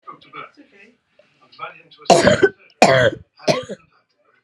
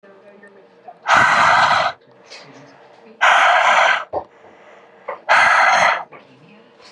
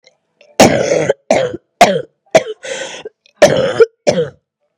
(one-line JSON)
{"three_cough_length": "4.4 s", "three_cough_amplitude": 32768, "three_cough_signal_mean_std_ratio": 0.36, "exhalation_length": "6.9 s", "exhalation_amplitude": 32638, "exhalation_signal_mean_std_ratio": 0.55, "cough_length": "4.8 s", "cough_amplitude": 32768, "cough_signal_mean_std_ratio": 0.47, "survey_phase": "beta (2021-08-13 to 2022-03-07)", "age": "18-44", "gender": "Female", "wearing_mask": "No", "symptom_cough_any": true, "symptom_runny_or_blocked_nose": true, "symptom_shortness_of_breath": true, "symptom_fever_high_temperature": true, "symptom_headache": true, "symptom_change_to_sense_of_smell_or_taste": true, "symptom_other": true, "symptom_onset": "4 days", "smoker_status": "Never smoked", "respiratory_condition_asthma": false, "respiratory_condition_other": false, "recruitment_source": "Test and Trace", "submission_delay": "1 day", "covid_test_result": "Positive", "covid_test_method": "RT-qPCR", "covid_ct_value": 13.2, "covid_ct_gene": "ORF1ab gene", "covid_ct_mean": 13.5, "covid_viral_load": "36000000 copies/ml", "covid_viral_load_category": "High viral load (>1M copies/ml)"}